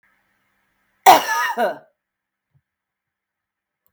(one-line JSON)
{"cough_length": "3.9 s", "cough_amplitude": 32497, "cough_signal_mean_std_ratio": 0.25, "survey_phase": "beta (2021-08-13 to 2022-03-07)", "age": "45-64", "gender": "Female", "wearing_mask": "No", "symptom_cough_any": true, "symptom_runny_or_blocked_nose": true, "symptom_fatigue": true, "symptom_headache": true, "symptom_onset": "3 days", "smoker_status": "Never smoked", "respiratory_condition_asthma": false, "respiratory_condition_other": false, "recruitment_source": "Test and Trace", "submission_delay": "2 days", "covid_test_result": "Negative", "covid_test_method": "ePCR"}